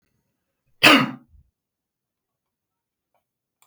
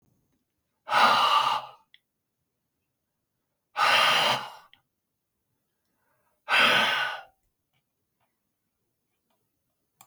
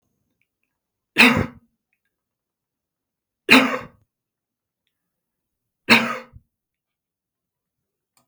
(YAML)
cough_length: 3.7 s
cough_amplitude: 32768
cough_signal_mean_std_ratio: 0.2
exhalation_length: 10.1 s
exhalation_amplitude: 13894
exhalation_signal_mean_std_ratio: 0.37
three_cough_length: 8.3 s
three_cough_amplitude: 32768
three_cough_signal_mean_std_ratio: 0.22
survey_phase: beta (2021-08-13 to 2022-03-07)
age: 65+
gender: Male
wearing_mask: 'No'
symptom_none: true
smoker_status: Never smoked
respiratory_condition_asthma: false
respiratory_condition_other: false
recruitment_source: REACT
submission_delay: 1 day
covid_test_result: Negative
covid_test_method: RT-qPCR
influenza_a_test_result: Negative
influenza_b_test_result: Negative